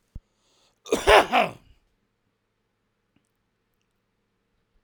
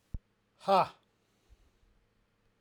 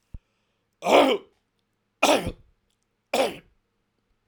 {"cough_length": "4.8 s", "cough_amplitude": 27037, "cough_signal_mean_std_ratio": 0.23, "exhalation_length": "2.6 s", "exhalation_amplitude": 6566, "exhalation_signal_mean_std_ratio": 0.24, "three_cough_length": "4.3 s", "three_cough_amplitude": 24697, "three_cough_signal_mean_std_ratio": 0.32, "survey_phase": "beta (2021-08-13 to 2022-03-07)", "age": "45-64", "gender": "Male", "wearing_mask": "No", "symptom_none": true, "smoker_status": "Ex-smoker", "respiratory_condition_asthma": false, "respiratory_condition_other": false, "recruitment_source": "REACT", "submission_delay": "2 days", "covid_test_result": "Negative", "covid_test_method": "RT-qPCR"}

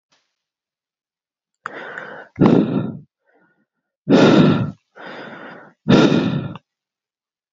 {"exhalation_length": "7.5 s", "exhalation_amplitude": 29992, "exhalation_signal_mean_std_ratio": 0.4, "survey_phase": "beta (2021-08-13 to 2022-03-07)", "age": "18-44", "gender": "Male", "wearing_mask": "No", "symptom_cough_any": true, "symptom_new_continuous_cough": true, "symptom_runny_or_blocked_nose": true, "symptom_onset": "14 days", "smoker_status": "Never smoked", "respiratory_condition_asthma": false, "respiratory_condition_other": false, "recruitment_source": "Test and Trace", "submission_delay": "1 day", "covid_test_result": "Positive", "covid_test_method": "RT-qPCR"}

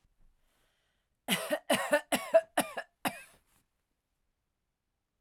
{"cough_length": "5.2 s", "cough_amplitude": 8260, "cough_signal_mean_std_ratio": 0.3, "survey_phase": "alpha (2021-03-01 to 2021-08-12)", "age": "45-64", "gender": "Female", "wearing_mask": "No", "symptom_none": true, "smoker_status": "Never smoked", "respiratory_condition_asthma": false, "respiratory_condition_other": false, "recruitment_source": "REACT", "submission_delay": "1 day", "covid_test_result": "Negative", "covid_test_method": "RT-qPCR"}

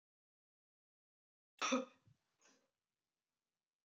{"cough_length": "3.8 s", "cough_amplitude": 2091, "cough_signal_mean_std_ratio": 0.2, "survey_phase": "beta (2021-08-13 to 2022-03-07)", "age": "45-64", "gender": "Female", "wearing_mask": "No", "symptom_none": true, "smoker_status": "Never smoked", "respiratory_condition_asthma": true, "respiratory_condition_other": false, "recruitment_source": "REACT", "submission_delay": "3 days", "covid_test_result": "Negative", "covid_test_method": "RT-qPCR"}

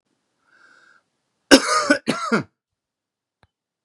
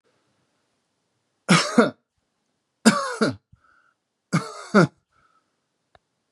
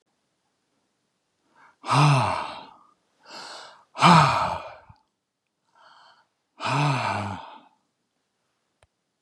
{"cough_length": "3.8 s", "cough_amplitude": 32768, "cough_signal_mean_std_ratio": 0.28, "three_cough_length": "6.3 s", "three_cough_amplitude": 27626, "three_cough_signal_mean_std_ratio": 0.29, "exhalation_length": "9.2 s", "exhalation_amplitude": 25124, "exhalation_signal_mean_std_ratio": 0.35, "survey_phase": "beta (2021-08-13 to 2022-03-07)", "age": "45-64", "gender": "Male", "wearing_mask": "No", "symptom_none": true, "smoker_status": "Ex-smoker", "respiratory_condition_asthma": false, "respiratory_condition_other": false, "recruitment_source": "REACT", "submission_delay": "4 days", "covid_test_result": "Negative", "covid_test_method": "RT-qPCR", "influenza_a_test_result": "Negative", "influenza_b_test_result": "Negative"}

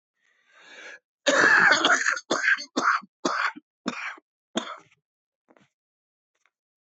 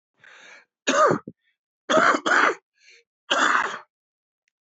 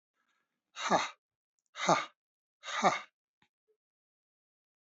{"cough_length": "6.9 s", "cough_amplitude": 18301, "cough_signal_mean_std_ratio": 0.42, "three_cough_length": "4.6 s", "three_cough_amplitude": 20970, "three_cough_signal_mean_std_ratio": 0.44, "exhalation_length": "4.9 s", "exhalation_amplitude": 8919, "exhalation_signal_mean_std_ratio": 0.29, "survey_phase": "beta (2021-08-13 to 2022-03-07)", "age": "45-64", "gender": "Male", "wearing_mask": "No", "symptom_cough_any": true, "symptom_runny_or_blocked_nose": true, "symptom_fatigue": true, "symptom_fever_high_temperature": true, "symptom_headache": true, "symptom_onset": "3 days", "smoker_status": "Ex-smoker", "respiratory_condition_asthma": true, "respiratory_condition_other": false, "recruitment_source": "Test and Trace", "submission_delay": "2 days", "covid_test_result": "Positive", "covid_test_method": "RT-qPCR", "covid_ct_value": 19.0, "covid_ct_gene": "ORF1ab gene", "covid_ct_mean": 19.5, "covid_viral_load": "400000 copies/ml", "covid_viral_load_category": "Low viral load (10K-1M copies/ml)"}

